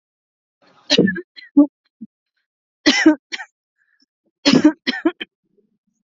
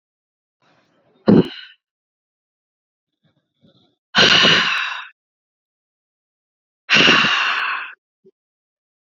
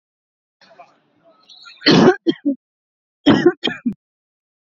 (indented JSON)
{
  "three_cough_length": "6.1 s",
  "three_cough_amplitude": 31109,
  "three_cough_signal_mean_std_ratio": 0.32,
  "exhalation_length": "9.0 s",
  "exhalation_amplitude": 30849,
  "exhalation_signal_mean_std_ratio": 0.35,
  "cough_length": "4.8 s",
  "cough_amplitude": 31487,
  "cough_signal_mean_std_ratio": 0.33,
  "survey_phase": "beta (2021-08-13 to 2022-03-07)",
  "age": "18-44",
  "gender": "Female",
  "wearing_mask": "No",
  "symptom_fatigue": true,
  "symptom_onset": "12 days",
  "smoker_status": "Ex-smoker",
  "respiratory_condition_asthma": false,
  "respiratory_condition_other": false,
  "recruitment_source": "REACT",
  "submission_delay": "2 days",
  "covid_test_result": "Negative",
  "covid_test_method": "RT-qPCR",
  "influenza_a_test_result": "Negative",
  "influenza_b_test_result": "Negative"
}